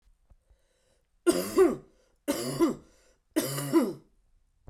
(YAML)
three_cough_length: 4.7 s
three_cough_amplitude: 9798
three_cough_signal_mean_std_ratio: 0.41
survey_phase: beta (2021-08-13 to 2022-03-07)
age: 18-44
gender: Male
wearing_mask: 'No'
symptom_cough_any: true
symptom_sore_throat: true
symptom_fatigue: true
symptom_headache: true
symptom_onset: 5 days
smoker_status: Never smoked
respiratory_condition_asthma: false
respiratory_condition_other: false
recruitment_source: Test and Trace
submission_delay: 2 days
covid_test_result: Positive
covid_test_method: RT-qPCR
covid_ct_value: 12.7
covid_ct_gene: ORF1ab gene